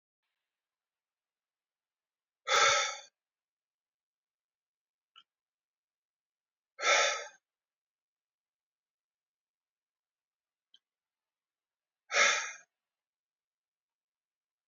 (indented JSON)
{
  "exhalation_length": "14.7 s",
  "exhalation_amplitude": 7638,
  "exhalation_signal_mean_std_ratio": 0.22,
  "survey_phase": "beta (2021-08-13 to 2022-03-07)",
  "age": "45-64",
  "gender": "Male",
  "wearing_mask": "No",
  "symptom_new_continuous_cough": true,
  "symptom_fatigue": true,
  "symptom_headache": true,
  "smoker_status": "Ex-smoker",
  "respiratory_condition_asthma": false,
  "respiratory_condition_other": false,
  "recruitment_source": "Test and Trace",
  "submission_delay": "2 days",
  "covid_test_result": "Positive",
  "covid_test_method": "ePCR"
}